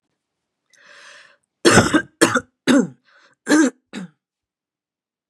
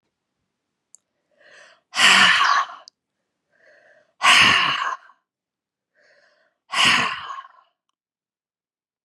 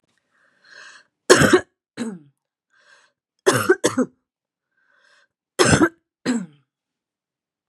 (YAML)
cough_length: 5.3 s
cough_amplitude: 32488
cough_signal_mean_std_ratio: 0.34
exhalation_length: 9.0 s
exhalation_amplitude: 29644
exhalation_signal_mean_std_ratio: 0.36
three_cough_length: 7.7 s
three_cough_amplitude: 32768
three_cough_signal_mean_std_ratio: 0.3
survey_phase: beta (2021-08-13 to 2022-03-07)
age: 45-64
gender: Female
wearing_mask: 'No'
symptom_cough_any: true
smoker_status: Never smoked
respiratory_condition_asthma: false
respiratory_condition_other: false
recruitment_source: REACT
submission_delay: 2 days
covid_test_result: Negative
covid_test_method: RT-qPCR
influenza_a_test_result: Negative
influenza_b_test_result: Negative